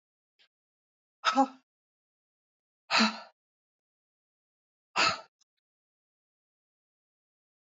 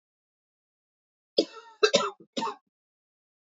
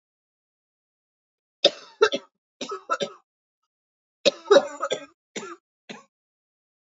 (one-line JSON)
{"exhalation_length": "7.7 s", "exhalation_amplitude": 9491, "exhalation_signal_mean_std_ratio": 0.22, "cough_length": "3.6 s", "cough_amplitude": 15276, "cough_signal_mean_std_ratio": 0.25, "three_cough_length": "6.8 s", "three_cough_amplitude": 28517, "three_cough_signal_mean_std_ratio": 0.24, "survey_phase": "beta (2021-08-13 to 2022-03-07)", "age": "45-64", "gender": "Female", "wearing_mask": "No", "symptom_cough_any": true, "symptom_new_continuous_cough": true, "symptom_runny_or_blocked_nose": true, "symptom_sore_throat": true, "symptom_abdominal_pain": true, "symptom_diarrhoea": true, "symptom_fever_high_temperature": true, "symptom_headache": true, "symptom_onset": "4 days", "smoker_status": "Never smoked", "respiratory_condition_asthma": false, "respiratory_condition_other": false, "recruitment_source": "Test and Trace", "submission_delay": "2 days", "covid_test_result": "Positive", "covid_test_method": "RT-qPCR", "covid_ct_value": 28.1, "covid_ct_gene": "ORF1ab gene", "covid_ct_mean": 28.4, "covid_viral_load": "500 copies/ml", "covid_viral_load_category": "Minimal viral load (< 10K copies/ml)"}